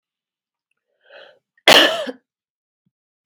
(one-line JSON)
{"cough_length": "3.3 s", "cough_amplitude": 32768, "cough_signal_mean_std_ratio": 0.24, "survey_phase": "beta (2021-08-13 to 2022-03-07)", "age": "18-44", "gender": "Female", "wearing_mask": "No", "symptom_none": true, "smoker_status": "Never smoked", "respiratory_condition_asthma": false, "respiratory_condition_other": false, "recruitment_source": "Test and Trace", "submission_delay": "2 days", "covid_test_result": "Negative", "covid_test_method": "RT-qPCR"}